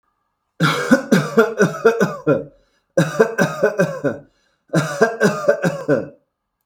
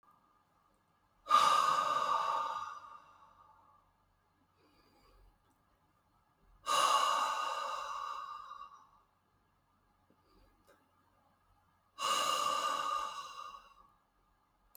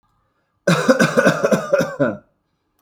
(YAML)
three_cough_length: 6.7 s
three_cough_amplitude: 32768
three_cough_signal_mean_std_ratio: 0.57
exhalation_length: 14.8 s
exhalation_amplitude: 5778
exhalation_signal_mean_std_ratio: 0.45
cough_length: 2.8 s
cough_amplitude: 32768
cough_signal_mean_std_ratio: 0.54
survey_phase: beta (2021-08-13 to 2022-03-07)
age: 18-44
gender: Male
wearing_mask: 'No'
symptom_runny_or_blocked_nose: true
symptom_onset: 6 days
smoker_status: Ex-smoker
respiratory_condition_asthma: false
respiratory_condition_other: false
recruitment_source: REACT
submission_delay: 3 days
covid_test_result: Negative
covid_test_method: RT-qPCR
influenza_a_test_result: Negative
influenza_b_test_result: Negative